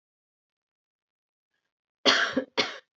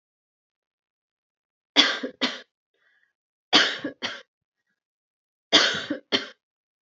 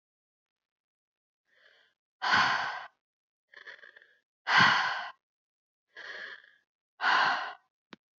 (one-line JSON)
{"cough_length": "3.0 s", "cough_amplitude": 16055, "cough_signal_mean_std_ratio": 0.29, "three_cough_length": "6.9 s", "three_cough_amplitude": 29038, "three_cough_signal_mean_std_ratio": 0.3, "exhalation_length": "8.2 s", "exhalation_amplitude": 10050, "exhalation_signal_mean_std_ratio": 0.36, "survey_phase": "beta (2021-08-13 to 2022-03-07)", "age": "18-44", "gender": "Female", "wearing_mask": "No", "symptom_cough_any": true, "symptom_runny_or_blocked_nose": true, "symptom_sore_throat": true, "symptom_headache": true, "symptom_other": true, "symptom_onset": "5 days", "smoker_status": "Never smoked", "respiratory_condition_asthma": false, "respiratory_condition_other": false, "recruitment_source": "Test and Trace", "submission_delay": "2 days", "covid_test_result": "Positive", "covid_test_method": "LAMP"}